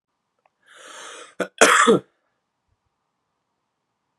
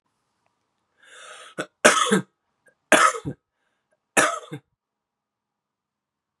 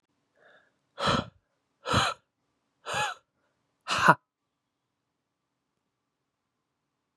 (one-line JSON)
{"cough_length": "4.2 s", "cough_amplitude": 32761, "cough_signal_mean_std_ratio": 0.26, "three_cough_length": "6.4 s", "three_cough_amplitude": 32767, "three_cough_signal_mean_std_ratio": 0.28, "exhalation_length": "7.2 s", "exhalation_amplitude": 27718, "exhalation_signal_mean_std_ratio": 0.26, "survey_phase": "beta (2021-08-13 to 2022-03-07)", "age": "18-44", "gender": "Male", "wearing_mask": "No", "symptom_runny_or_blocked_nose": true, "symptom_sore_throat": true, "symptom_fatigue": true, "symptom_change_to_sense_of_smell_or_taste": true, "smoker_status": "Never smoked", "respiratory_condition_asthma": false, "respiratory_condition_other": false, "recruitment_source": "Test and Trace", "submission_delay": "1 day", "covid_test_result": "Positive", "covid_test_method": "LFT"}